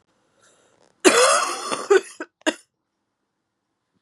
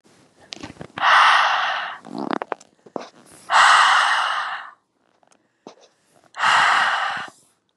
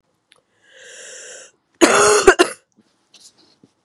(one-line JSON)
{"cough_length": "4.0 s", "cough_amplitude": 32296, "cough_signal_mean_std_ratio": 0.35, "exhalation_length": "7.8 s", "exhalation_amplitude": 25533, "exhalation_signal_mean_std_ratio": 0.52, "three_cough_length": "3.8 s", "three_cough_amplitude": 32768, "three_cough_signal_mean_std_ratio": 0.32, "survey_phase": "beta (2021-08-13 to 2022-03-07)", "age": "18-44", "gender": "Female", "wearing_mask": "No", "symptom_cough_any": true, "symptom_runny_or_blocked_nose": true, "symptom_sore_throat": true, "symptom_fever_high_temperature": true, "symptom_headache": true, "smoker_status": "Never smoked", "respiratory_condition_asthma": false, "respiratory_condition_other": false, "recruitment_source": "Test and Trace", "submission_delay": "1 day", "covid_test_result": "Positive", "covid_test_method": "LFT"}